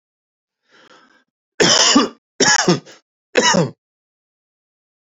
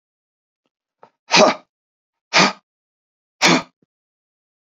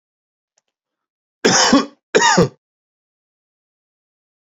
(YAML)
three_cough_length: 5.1 s
three_cough_amplitude: 32768
three_cough_signal_mean_std_ratio: 0.39
exhalation_length: 4.8 s
exhalation_amplitude: 31983
exhalation_signal_mean_std_ratio: 0.28
cough_length: 4.4 s
cough_amplitude: 32768
cough_signal_mean_std_ratio: 0.33
survey_phase: beta (2021-08-13 to 2022-03-07)
age: 45-64
gender: Male
wearing_mask: 'No'
symptom_none: true
smoker_status: Ex-smoker
respiratory_condition_asthma: false
respiratory_condition_other: false
recruitment_source: REACT
submission_delay: 2 days
covid_test_result: Negative
covid_test_method: RT-qPCR
influenza_a_test_result: Negative
influenza_b_test_result: Negative